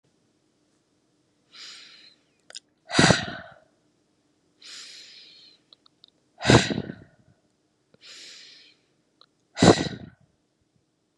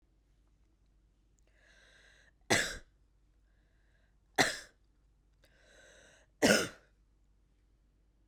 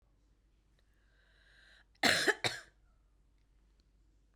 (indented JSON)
{
  "exhalation_length": "11.2 s",
  "exhalation_amplitude": 28591,
  "exhalation_signal_mean_std_ratio": 0.23,
  "three_cough_length": "8.3 s",
  "three_cough_amplitude": 9014,
  "three_cough_signal_mean_std_ratio": 0.23,
  "cough_length": "4.4 s",
  "cough_amplitude": 8374,
  "cough_signal_mean_std_ratio": 0.25,
  "survey_phase": "beta (2021-08-13 to 2022-03-07)",
  "age": "18-44",
  "gender": "Female",
  "wearing_mask": "No",
  "symptom_none": true,
  "symptom_onset": "5 days",
  "smoker_status": "Ex-smoker",
  "respiratory_condition_asthma": false,
  "respiratory_condition_other": false,
  "recruitment_source": "REACT",
  "submission_delay": "3 days",
  "covid_test_result": "Negative",
  "covid_test_method": "RT-qPCR",
  "influenza_a_test_result": "Unknown/Void",
  "influenza_b_test_result": "Unknown/Void"
}